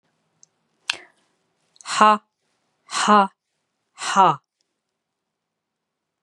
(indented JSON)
{
  "exhalation_length": "6.2 s",
  "exhalation_amplitude": 29733,
  "exhalation_signal_mean_std_ratio": 0.27,
  "survey_phase": "beta (2021-08-13 to 2022-03-07)",
  "age": "65+",
  "gender": "Female",
  "wearing_mask": "No",
  "symptom_runny_or_blocked_nose": true,
  "smoker_status": "Never smoked",
  "respiratory_condition_asthma": false,
  "respiratory_condition_other": false,
  "recruitment_source": "REACT",
  "submission_delay": "1 day",
  "covid_test_result": "Negative",
  "covid_test_method": "RT-qPCR"
}